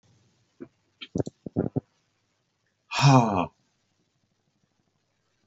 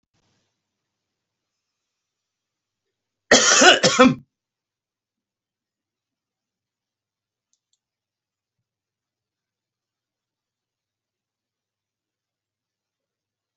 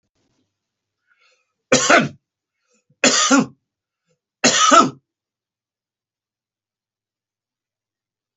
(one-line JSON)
{"exhalation_length": "5.5 s", "exhalation_amplitude": 22003, "exhalation_signal_mean_std_ratio": 0.26, "cough_length": "13.6 s", "cough_amplitude": 31618, "cough_signal_mean_std_ratio": 0.18, "three_cough_length": "8.4 s", "three_cough_amplitude": 31120, "three_cough_signal_mean_std_ratio": 0.29, "survey_phase": "beta (2021-08-13 to 2022-03-07)", "age": "65+", "gender": "Male", "wearing_mask": "No", "symptom_none": true, "smoker_status": "Ex-smoker", "respiratory_condition_asthma": false, "respiratory_condition_other": false, "recruitment_source": "REACT", "submission_delay": "2 days", "covid_test_result": "Negative", "covid_test_method": "RT-qPCR"}